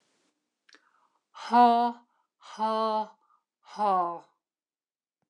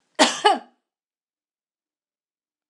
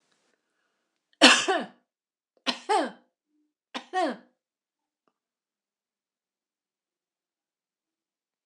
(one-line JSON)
{"exhalation_length": "5.3 s", "exhalation_amplitude": 10679, "exhalation_signal_mean_std_ratio": 0.39, "cough_length": "2.7 s", "cough_amplitude": 25376, "cough_signal_mean_std_ratio": 0.24, "three_cough_length": "8.5 s", "three_cough_amplitude": 26028, "three_cough_signal_mean_std_ratio": 0.21, "survey_phase": "beta (2021-08-13 to 2022-03-07)", "age": "65+", "gender": "Female", "wearing_mask": "No", "symptom_none": true, "smoker_status": "Never smoked", "respiratory_condition_asthma": false, "respiratory_condition_other": false, "recruitment_source": "REACT", "submission_delay": "2 days", "covid_test_result": "Negative", "covid_test_method": "RT-qPCR", "influenza_a_test_result": "Negative", "influenza_b_test_result": "Negative"}